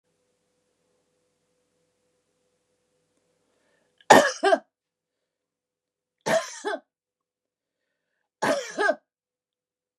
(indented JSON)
{
  "three_cough_length": "10.0 s",
  "three_cough_amplitude": 29204,
  "three_cough_signal_mean_std_ratio": 0.22,
  "survey_phase": "beta (2021-08-13 to 2022-03-07)",
  "age": "65+",
  "gender": "Female",
  "wearing_mask": "No",
  "symptom_fatigue": true,
  "symptom_headache": true,
  "smoker_status": "Never smoked",
  "respiratory_condition_asthma": false,
  "respiratory_condition_other": false,
  "recruitment_source": "REACT",
  "submission_delay": "2 days",
  "covid_test_result": "Negative",
  "covid_test_method": "RT-qPCR",
  "influenza_a_test_result": "Negative",
  "influenza_b_test_result": "Negative"
}